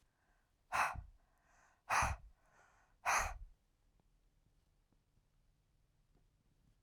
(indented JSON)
{
  "exhalation_length": "6.8 s",
  "exhalation_amplitude": 2477,
  "exhalation_signal_mean_std_ratio": 0.3,
  "survey_phase": "beta (2021-08-13 to 2022-03-07)",
  "age": "45-64",
  "gender": "Female",
  "wearing_mask": "No",
  "symptom_cough_any": true,
  "symptom_runny_or_blocked_nose": true,
  "symptom_sore_throat": true,
  "symptom_fatigue": true,
  "symptom_headache": true,
  "symptom_other": true,
  "symptom_onset": "2 days",
  "smoker_status": "Current smoker (11 or more cigarettes per day)",
  "respiratory_condition_asthma": false,
  "respiratory_condition_other": false,
  "recruitment_source": "Test and Trace",
  "submission_delay": "1 day",
  "covid_test_result": "Negative",
  "covid_test_method": "RT-qPCR"
}